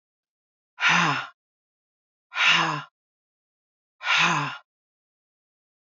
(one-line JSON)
{"exhalation_length": "5.9 s", "exhalation_amplitude": 15706, "exhalation_signal_mean_std_ratio": 0.39, "survey_phase": "beta (2021-08-13 to 2022-03-07)", "age": "45-64", "gender": "Female", "wearing_mask": "No", "symptom_cough_any": true, "symptom_runny_or_blocked_nose": true, "symptom_fever_high_temperature": true, "symptom_other": true, "symptom_onset": "4 days", "smoker_status": "Ex-smoker", "respiratory_condition_asthma": false, "respiratory_condition_other": false, "recruitment_source": "Test and Trace", "submission_delay": "1 day", "covid_test_result": "Positive", "covid_test_method": "RT-qPCR", "covid_ct_value": 22.7, "covid_ct_gene": "ORF1ab gene", "covid_ct_mean": 22.8, "covid_viral_load": "33000 copies/ml", "covid_viral_load_category": "Low viral load (10K-1M copies/ml)"}